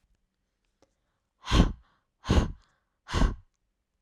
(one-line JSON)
{"exhalation_length": "4.0 s", "exhalation_amplitude": 18470, "exhalation_signal_mean_std_ratio": 0.31, "survey_phase": "alpha (2021-03-01 to 2021-08-12)", "age": "18-44", "gender": "Female", "wearing_mask": "No", "symptom_none": true, "smoker_status": "Never smoked", "respiratory_condition_asthma": false, "respiratory_condition_other": false, "recruitment_source": "REACT", "submission_delay": "1 day", "covid_test_result": "Negative", "covid_test_method": "RT-qPCR"}